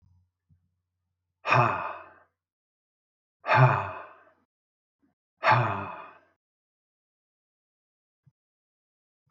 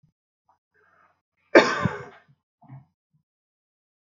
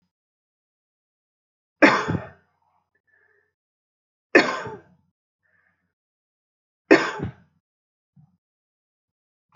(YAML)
exhalation_length: 9.3 s
exhalation_amplitude: 15250
exhalation_signal_mean_std_ratio: 0.28
cough_length: 4.0 s
cough_amplitude: 27943
cough_signal_mean_std_ratio: 0.19
three_cough_length: 9.6 s
three_cough_amplitude: 27342
three_cough_signal_mean_std_ratio: 0.2
survey_phase: alpha (2021-03-01 to 2021-08-12)
age: 45-64
gender: Male
wearing_mask: 'No'
symptom_none: true
smoker_status: Never smoked
respiratory_condition_asthma: false
respiratory_condition_other: false
recruitment_source: REACT
submission_delay: 1 day
covid_test_result: Negative
covid_test_method: RT-qPCR